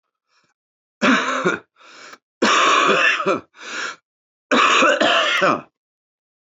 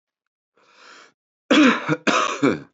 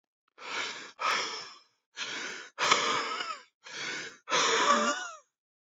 three_cough_length: 6.6 s
three_cough_amplitude: 19982
three_cough_signal_mean_std_ratio: 0.57
cough_length: 2.7 s
cough_amplitude: 20273
cough_signal_mean_std_ratio: 0.45
exhalation_length: 5.7 s
exhalation_amplitude: 13724
exhalation_signal_mean_std_ratio: 0.59
survey_phase: beta (2021-08-13 to 2022-03-07)
age: 18-44
gender: Male
wearing_mask: 'No'
symptom_cough_any: true
symptom_runny_or_blocked_nose: true
symptom_shortness_of_breath: true
symptom_sore_throat: true
symptom_loss_of_taste: true
symptom_onset: 3 days
smoker_status: Current smoker (11 or more cigarettes per day)
respiratory_condition_asthma: false
respiratory_condition_other: false
recruitment_source: Test and Trace
submission_delay: 1 day
covid_test_result: Positive
covid_test_method: RT-qPCR
covid_ct_value: 17.2
covid_ct_gene: ORF1ab gene
covid_ct_mean: 17.6
covid_viral_load: 1700000 copies/ml
covid_viral_load_category: High viral load (>1M copies/ml)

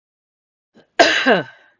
cough_length: 1.8 s
cough_amplitude: 32768
cough_signal_mean_std_ratio: 0.37
survey_phase: beta (2021-08-13 to 2022-03-07)
age: 45-64
gender: Female
wearing_mask: 'No'
symptom_runny_or_blocked_nose: true
symptom_sore_throat: true
smoker_status: Never smoked
respiratory_condition_asthma: true
respiratory_condition_other: false
recruitment_source: REACT
submission_delay: 1 day
covid_test_result: Negative
covid_test_method: RT-qPCR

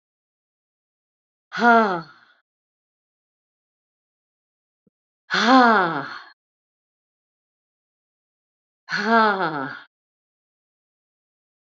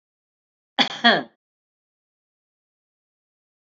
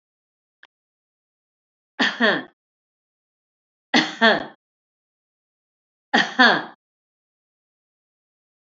exhalation_length: 11.6 s
exhalation_amplitude: 24730
exhalation_signal_mean_std_ratio: 0.29
cough_length: 3.7 s
cough_amplitude: 23847
cough_signal_mean_std_ratio: 0.2
three_cough_length: 8.6 s
three_cough_amplitude: 28373
three_cough_signal_mean_std_ratio: 0.26
survey_phase: alpha (2021-03-01 to 2021-08-12)
age: 65+
gender: Female
wearing_mask: 'No'
symptom_cough_any: true
symptom_shortness_of_breath: true
symptom_fatigue: true
symptom_onset: 11 days
smoker_status: Ex-smoker
respiratory_condition_asthma: false
respiratory_condition_other: false
recruitment_source: REACT
covid_test_method: RT-qPCR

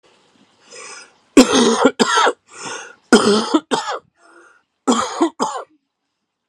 cough_length: 6.5 s
cough_amplitude: 32768
cough_signal_mean_std_ratio: 0.44
survey_phase: alpha (2021-03-01 to 2021-08-12)
age: 45-64
gender: Male
wearing_mask: 'No'
symptom_cough_any: true
symptom_shortness_of_breath: true
symptom_fatigue: true
symptom_headache: true
symptom_change_to_sense_of_smell_or_taste: true
symptom_loss_of_taste: true
symptom_onset: 4 days
smoker_status: Never smoked
respiratory_condition_asthma: false
respiratory_condition_other: true
recruitment_source: Test and Trace
submission_delay: 2 days
covid_test_result: Positive
covid_test_method: RT-qPCR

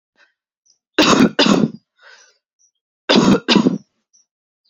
cough_length: 4.7 s
cough_amplitude: 32146
cough_signal_mean_std_ratio: 0.41
survey_phase: alpha (2021-03-01 to 2021-08-12)
age: 18-44
gender: Female
wearing_mask: 'No'
symptom_shortness_of_breath: true
symptom_fatigue: true
symptom_fever_high_temperature: true
symptom_headache: true
symptom_onset: 3 days
smoker_status: Never smoked
respiratory_condition_asthma: false
respiratory_condition_other: false
recruitment_source: Test and Trace
submission_delay: 1 day
covid_test_result: Positive
covid_test_method: RT-qPCR
covid_ct_value: 30.7
covid_ct_gene: N gene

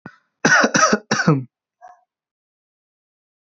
cough_length: 3.4 s
cough_amplitude: 25875
cough_signal_mean_std_ratio: 0.38
survey_phase: beta (2021-08-13 to 2022-03-07)
age: 18-44
gender: Male
wearing_mask: 'No'
symptom_none: true
smoker_status: Current smoker (e-cigarettes or vapes only)
respiratory_condition_asthma: false
respiratory_condition_other: false
recruitment_source: REACT
submission_delay: 1 day
covid_test_result: Negative
covid_test_method: RT-qPCR
influenza_a_test_result: Negative
influenza_b_test_result: Negative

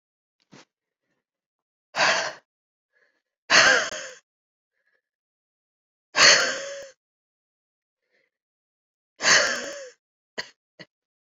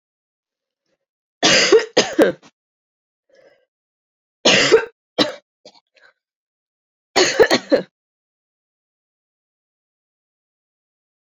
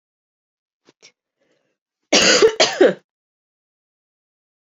exhalation_length: 11.3 s
exhalation_amplitude: 28208
exhalation_signal_mean_std_ratio: 0.29
three_cough_length: 11.3 s
three_cough_amplitude: 30984
three_cough_signal_mean_std_ratio: 0.3
cough_length: 4.8 s
cough_amplitude: 32767
cough_signal_mean_std_ratio: 0.29
survey_phase: beta (2021-08-13 to 2022-03-07)
age: 18-44
gender: Female
wearing_mask: 'No'
symptom_cough_any: true
symptom_runny_or_blocked_nose: true
symptom_fatigue: true
symptom_change_to_sense_of_smell_or_taste: true
symptom_loss_of_taste: true
symptom_onset: 4 days
smoker_status: Never smoked
respiratory_condition_asthma: false
respiratory_condition_other: false
recruitment_source: Test and Trace
submission_delay: 2 days
covid_test_result: Positive
covid_test_method: RT-qPCR
covid_ct_value: 15.9
covid_ct_gene: ORF1ab gene
covid_ct_mean: 16.4
covid_viral_load: 4100000 copies/ml
covid_viral_load_category: High viral load (>1M copies/ml)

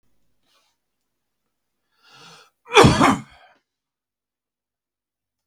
cough_length: 5.5 s
cough_amplitude: 32768
cough_signal_mean_std_ratio: 0.22
survey_phase: beta (2021-08-13 to 2022-03-07)
age: 45-64
gender: Male
wearing_mask: 'No'
symptom_none: true
smoker_status: Never smoked
respiratory_condition_asthma: false
respiratory_condition_other: false
recruitment_source: Test and Trace
submission_delay: 0 days
covid_test_result: Negative
covid_test_method: LFT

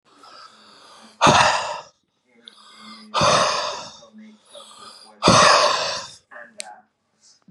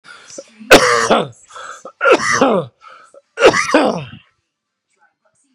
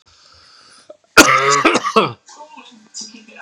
exhalation_length: 7.5 s
exhalation_amplitude: 31649
exhalation_signal_mean_std_ratio: 0.42
three_cough_length: 5.5 s
three_cough_amplitude: 32768
three_cough_signal_mean_std_ratio: 0.44
cough_length: 3.4 s
cough_amplitude: 32768
cough_signal_mean_std_ratio: 0.4
survey_phase: beta (2021-08-13 to 2022-03-07)
age: 45-64
gender: Male
wearing_mask: 'No'
symptom_cough_any: true
symptom_new_continuous_cough: true
symptom_runny_or_blocked_nose: true
symptom_shortness_of_breath: true
symptom_sore_throat: true
symptom_fatigue: true
symptom_fever_high_temperature: true
symptom_headache: true
symptom_change_to_sense_of_smell_or_taste: true
symptom_loss_of_taste: true
symptom_onset: 3 days
smoker_status: Never smoked
respiratory_condition_asthma: true
respiratory_condition_other: false
recruitment_source: Test and Trace
submission_delay: 1 day
covid_test_result: Positive
covid_test_method: ePCR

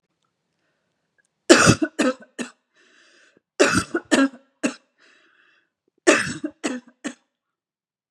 three_cough_length: 8.1 s
three_cough_amplitude: 32768
three_cough_signal_mean_std_ratio: 0.31
survey_phase: beta (2021-08-13 to 2022-03-07)
age: 45-64
gender: Female
wearing_mask: 'No'
symptom_sore_throat: true
symptom_fatigue: true
symptom_headache: true
symptom_onset: 3 days
smoker_status: Never smoked
respiratory_condition_asthma: false
respiratory_condition_other: false
recruitment_source: Test and Trace
submission_delay: 1 day
covid_test_result: Positive
covid_test_method: RT-qPCR
covid_ct_value: 28.2
covid_ct_gene: N gene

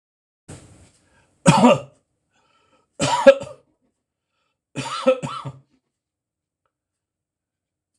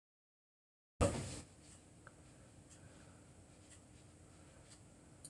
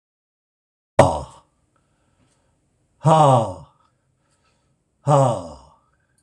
three_cough_length: 8.0 s
three_cough_amplitude: 26028
three_cough_signal_mean_std_ratio: 0.26
cough_length: 5.3 s
cough_amplitude: 3136
cough_signal_mean_std_ratio: 0.32
exhalation_length: 6.2 s
exhalation_amplitude: 26028
exhalation_signal_mean_std_ratio: 0.32
survey_phase: beta (2021-08-13 to 2022-03-07)
age: 65+
gender: Male
wearing_mask: 'No'
symptom_none: true
smoker_status: Never smoked
respiratory_condition_asthma: false
respiratory_condition_other: false
recruitment_source: REACT
submission_delay: 6 days
covid_test_result: Negative
covid_test_method: RT-qPCR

